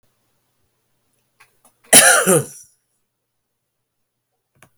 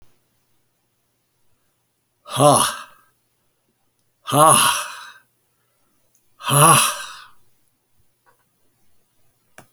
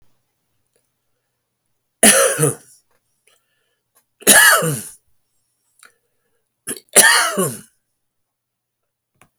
{"cough_length": "4.8 s", "cough_amplitude": 32768, "cough_signal_mean_std_ratio": 0.25, "exhalation_length": "9.7 s", "exhalation_amplitude": 32768, "exhalation_signal_mean_std_ratio": 0.31, "three_cough_length": "9.4 s", "three_cough_amplitude": 32768, "three_cough_signal_mean_std_ratio": 0.31, "survey_phase": "beta (2021-08-13 to 2022-03-07)", "age": "65+", "gender": "Male", "wearing_mask": "No", "symptom_none": true, "smoker_status": "Never smoked", "respiratory_condition_asthma": false, "respiratory_condition_other": false, "recruitment_source": "REACT", "submission_delay": "2 days", "covid_test_result": "Negative", "covid_test_method": "RT-qPCR", "influenza_a_test_result": "Negative", "influenza_b_test_result": "Negative"}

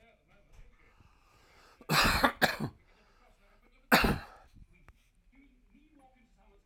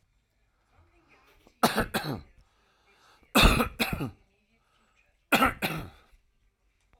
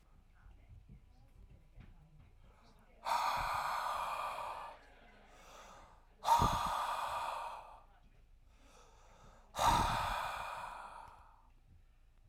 {"cough_length": "6.7 s", "cough_amplitude": 13387, "cough_signal_mean_std_ratio": 0.3, "three_cough_length": "7.0 s", "three_cough_amplitude": 15884, "three_cough_signal_mean_std_ratio": 0.32, "exhalation_length": "12.3 s", "exhalation_amplitude": 3798, "exhalation_signal_mean_std_ratio": 0.51, "survey_phase": "alpha (2021-03-01 to 2021-08-12)", "age": "45-64", "gender": "Male", "wearing_mask": "No", "symptom_cough_any": true, "symptom_onset": "12 days", "smoker_status": "Ex-smoker", "respiratory_condition_asthma": false, "respiratory_condition_other": false, "recruitment_source": "REACT", "submission_delay": "2 days", "covid_test_result": "Negative", "covid_test_method": "RT-qPCR"}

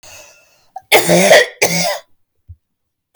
{"cough_length": "3.2 s", "cough_amplitude": 32768, "cough_signal_mean_std_ratio": 0.43, "survey_phase": "beta (2021-08-13 to 2022-03-07)", "age": "18-44", "gender": "Female", "wearing_mask": "No", "symptom_none": true, "smoker_status": "Never smoked", "respiratory_condition_asthma": false, "respiratory_condition_other": false, "recruitment_source": "REACT", "submission_delay": "2 days", "covid_test_result": "Negative", "covid_test_method": "RT-qPCR", "influenza_a_test_result": "Negative", "influenza_b_test_result": "Negative"}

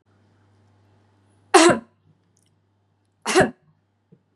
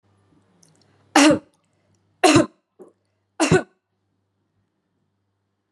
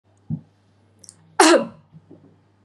{"exhalation_length": "4.4 s", "exhalation_amplitude": 32328, "exhalation_signal_mean_std_ratio": 0.25, "three_cough_length": "5.7 s", "three_cough_amplitude": 31853, "three_cough_signal_mean_std_ratio": 0.27, "cough_length": "2.6 s", "cough_amplitude": 30704, "cough_signal_mean_std_ratio": 0.28, "survey_phase": "beta (2021-08-13 to 2022-03-07)", "age": "45-64", "gender": "Female", "wearing_mask": "No", "symptom_shortness_of_breath": true, "symptom_abdominal_pain": true, "symptom_fatigue": true, "symptom_onset": "12 days", "smoker_status": "Never smoked", "respiratory_condition_asthma": true, "respiratory_condition_other": false, "recruitment_source": "REACT", "submission_delay": "1 day", "covid_test_result": "Negative", "covid_test_method": "RT-qPCR", "influenza_a_test_result": "Negative", "influenza_b_test_result": "Negative"}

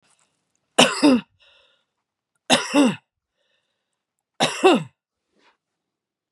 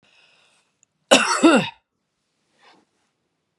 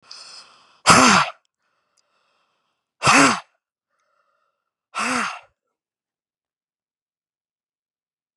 {"three_cough_length": "6.3 s", "three_cough_amplitude": 32673, "three_cough_signal_mean_std_ratio": 0.31, "cough_length": "3.6 s", "cough_amplitude": 32767, "cough_signal_mean_std_ratio": 0.28, "exhalation_length": "8.4 s", "exhalation_amplitude": 32768, "exhalation_signal_mean_std_ratio": 0.27, "survey_phase": "beta (2021-08-13 to 2022-03-07)", "age": "65+", "gender": "Female", "wearing_mask": "No", "symptom_none": true, "smoker_status": "Ex-smoker", "respiratory_condition_asthma": false, "respiratory_condition_other": false, "recruitment_source": "REACT", "submission_delay": "2 days", "covid_test_result": "Negative", "covid_test_method": "RT-qPCR", "influenza_a_test_result": "Negative", "influenza_b_test_result": "Negative"}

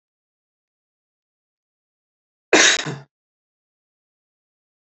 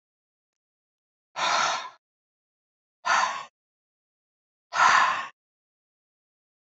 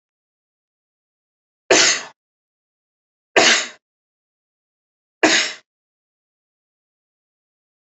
{"cough_length": "4.9 s", "cough_amplitude": 32484, "cough_signal_mean_std_ratio": 0.2, "exhalation_length": "6.7 s", "exhalation_amplitude": 14394, "exhalation_signal_mean_std_ratio": 0.34, "three_cough_length": "7.9 s", "three_cough_amplitude": 31113, "three_cough_signal_mean_std_ratio": 0.25, "survey_phase": "beta (2021-08-13 to 2022-03-07)", "age": "45-64", "gender": "Male", "wearing_mask": "No", "symptom_none": true, "smoker_status": "Never smoked", "respiratory_condition_asthma": false, "respiratory_condition_other": false, "recruitment_source": "REACT", "submission_delay": "3 days", "covid_test_result": "Negative", "covid_test_method": "RT-qPCR", "influenza_a_test_result": "Negative", "influenza_b_test_result": "Negative"}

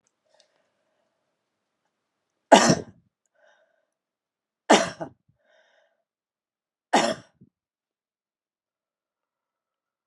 {"three_cough_length": "10.1 s", "three_cough_amplitude": 31612, "three_cough_signal_mean_std_ratio": 0.18, "survey_phase": "alpha (2021-03-01 to 2021-08-12)", "age": "65+", "gender": "Female", "wearing_mask": "No", "symptom_none": true, "smoker_status": "Never smoked", "respiratory_condition_asthma": false, "respiratory_condition_other": false, "recruitment_source": "REACT", "submission_delay": "1 day", "covid_test_result": "Negative", "covid_test_method": "RT-qPCR"}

